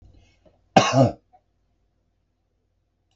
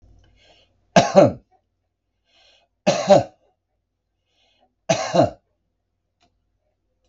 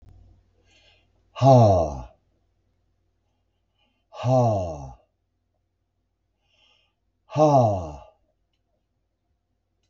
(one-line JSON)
{"cough_length": "3.2 s", "cough_amplitude": 32768, "cough_signal_mean_std_ratio": 0.24, "three_cough_length": "7.1 s", "three_cough_amplitude": 32768, "three_cough_signal_mean_std_ratio": 0.26, "exhalation_length": "9.9 s", "exhalation_amplitude": 24339, "exhalation_signal_mean_std_ratio": 0.31, "survey_phase": "beta (2021-08-13 to 2022-03-07)", "age": "65+", "gender": "Male", "wearing_mask": "No", "symptom_none": true, "smoker_status": "Ex-smoker", "respiratory_condition_asthma": false, "respiratory_condition_other": false, "recruitment_source": "REACT", "submission_delay": "1 day", "covid_test_result": "Negative", "covid_test_method": "RT-qPCR", "influenza_a_test_result": "Positive", "influenza_a_ct_value": 34.5, "influenza_b_test_result": "Negative"}